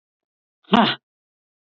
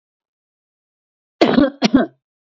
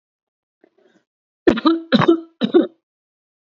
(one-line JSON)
{"exhalation_length": "1.8 s", "exhalation_amplitude": 27274, "exhalation_signal_mean_std_ratio": 0.25, "cough_length": "2.5 s", "cough_amplitude": 29176, "cough_signal_mean_std_ratio": 0.34, "three_cough_length": "3.4 s", "three_cough_amplitude": 27963, "three_cough_signal_mean_std_ratio": 0.35, "survey_phase": "beta (2021-08-13 to 2022-03-07)", "age": "18-44", "gender": "Female", "wearing_mask": "No", "symptom_none": true, "symptom_onset": "8 days", "smoker_status": "Ex-smoker", "respiratory_condition_asthma": false, "respiratory_condition_other": false, "recruitment_source": "Test and Trace", "submission_delay": "3 days", "covid_test_result": "Positive", "covid_test_method": "RT-qPCR", "covid_ct_value": 17.5, "covid_ct_gene": "ORF1ab gene"}